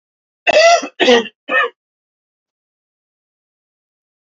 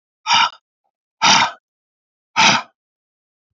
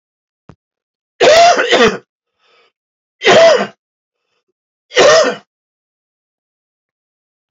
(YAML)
cough_length: 4.4 s
cough_amplitude: 29154
cough_signal_mean_std_ratio: 0.35
exhalation_length: 3.6 s
exhalation_amplitude: 32744
exhalation_signal_mean_std_ratio: 0.37
three_cough_length: 7.5 s
three_cough_amplitude: 30771
three_cough_signal_mean_std_ratio: 0.39
survey_phase: beta (2021-08-13 to 2022-03-07)
age: 45-64
gender: Male
wearing_mask: 'No'
symptom_cough_any: true
symptom_runny_or_blocked_nose: true
smoker_status: Never smoked
respiratory_condition_asthma: false
respiratory_condition_other: false
recruitment_source: Test and Trace
submission_delay: 3 days
covid_test_result: Positive
covid_test_method: LFT